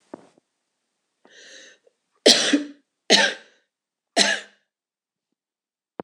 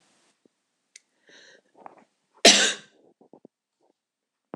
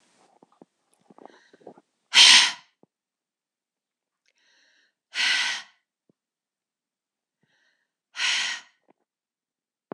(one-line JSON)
{"three_cough_length": "6.0 s", "three_cough_amplitude": 26028, "three_cough_signal_mean_std_ratio": 0.28, "cough_length": "4.6 s", "cough_amplitude": 26027, "cough_signal_mean_std_ratio": 0.19, "exhalation_length": "9.9 s", "exhalation_amplitude": 26027, "exhalation_signal_mean_std_ratio": 0.23, "survey_phase": "beta (2021-08-13 to 2022-03-07)", "age": "18-44", "gender": "Female", "wearing_mask": "No", "symptom_cough_any": true, "symptom_runny_or_blocked_nose": true, "symptom_sore_throat": true, "symptom_fatigue": true, "symptom_headache": true, "symptom_onset": "2 days", "smoker_status": "Never smoked", "respiratory_condition_asthma": false, "respiratory_condition_other": false, "recruitment_source": "Test and Trace", "submission_delay": "2 days", "covid_test_result": "Positive", "covid_test_method": "RT-qPCR", "covid_ct_value": 24.8, "covid_ct_gene": "ORF1ab gene", "covid_ct_mean": 25.4, "covid_viral_load": "4600 copies/ml", "covid_viral_load_category": "Minimal viral load (< 10K copies/ml)"}